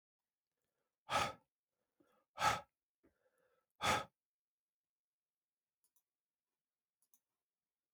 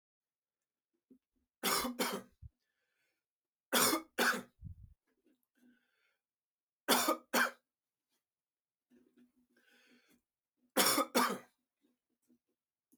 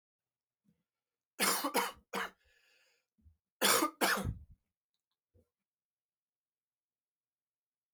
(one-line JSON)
{"exhalation_length": "7.9 s", "exhalation_amplitude": 2755, "exhalation_signal_mean_std_ratio": 0.22, "three_cough_length": "13.0 s", "three_cough_amplitude": 6533, "three_cough_signal_mean_std_ratio": 0.31, "cough_length": "7.9 s", "cough_amplitude": 6239, "cough_signal_mean_std_ratio": 0.3, "survey_phase": "beta (2021-08-13 to 2022-03-07)", "age": "45-64", "gender": "Male", "wearing_mask": "No", "symptom_cough_any": true, "symptom_new_continuous_cough": true, "symptom_sore_throat": true, "symptom_fatigue": true, "symptom_onset": "8 days", "smoker_status": "Never smoked", "respiratory_condition_asthma": false, "respiratory_condition_other": false, "recruitment_source": "REACT", "submission_delay": "1 day", "covid_test_result": "Positive", "covid_test_method": "RT-qPCR", "covid_ct_value": 23.7, "covid_ct_gene": "E gene", "influenza_a_test_result": "Negative", "influenza_b_test_result": "Negative"}